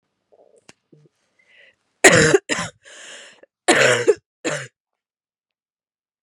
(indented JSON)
{
  "cough_length": "6.2 s",
  "cough_amplitude": 32768,
  "cough_signal_mean_std_ratio": 0.31,
  "survey_phase": "beta (2021-08-13 to 2022-03-07)",
  "age": "18-44",
  "gender": "Female",
  "wearing_mask": "No",
  "symptom_cough_any": true,
  "symptom_runny_or_blocked_nose": true,
  "symptom_sore_throat": true,
  "symptom_onset": "6 days",
  "smoker_status": "Never smoked",
  "respiratory_condition_asthma": false,
  "respiratory_condition_other": false,
  "recruitment_source": "Test and Trace",
  "submission_delay": "2 days",
  "covid_test_result": "Positive",
  "covid_test_method": "RT-qPCR",
  "covid_ct_value": 11.8,
  "covid_ct_gene": "ORF1ab gene",
  "covid_ct_mean": 11.9,
  "covid_viral_load": "120000000 copies/ml",
  "covid_viral_load_category": "High viral load (>1M copies/ml)"
}